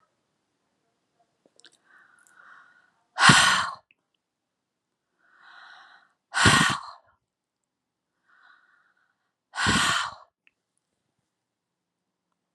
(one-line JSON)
{"exhalation_length": "12.5 s", "exhalation_amplitude": 28501, "exhalation_signal_mean_std_ratio": 0.26, "survey_phase": "beta (2021-08-13 to 2022-03-07)", "age": "65+", "gender": "Female", "wearing_mask": "No", "symptom_none": true, "smoker_status": "Never smoked", "respiratory_condition_asthma": false, "respiratory_condition_other": false, "recruitment_source": "REACT", "submission_delay": "2 days", "covid_test_result": "Negative", "covid_test_method": "RT-qPCR"}